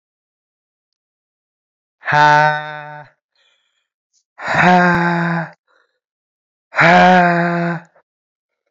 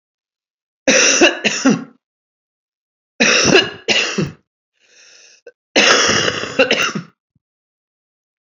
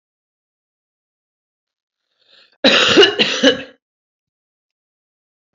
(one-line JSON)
{"exhalation_length": "8.7 s", "exhalation_amplitude": 29016, "exhalation_signal_mean_std_ratio": 0.43, "three_cough_length": "8.4 s", "three_cough_amplitude": 32768, "three_cough_signal_mean_std_ratio": 0.46, "cough_length": "5.5 s", "cough_amplitude": 29910, "cough_signal_mean_std_ratio": 0.3, "survey_phase": "beta (2021-08-13 to 2022-03-07)", "age": "18-44", "gender": "Male", "wearing_mask": "Yes", "symptom_cough_any": true, "symptom_runny_or_blocked_nose": true, "symptom_sore_throat": true, "symptom_fatigue": true, "symptom_headache": true, "symptom_onset": "4 days", "smoker_status": "Never smoked", "respiratory_condition_asthma": false, "respiratory_condition_other": false, "recruitment_source": "Test and Trace", "submission_delay": "2 days", "covid_test_result": "Positive", "covid_test_method": "RT-qPCR", "covid_ct_value": 15.9, "covid_ct_gene": "N gene", "covid_ct_mean": 16.1, "covid_viral_load": "5200000 copies/ml", "covid_viral_load_category": "High viral load (>1M copies/ml)"}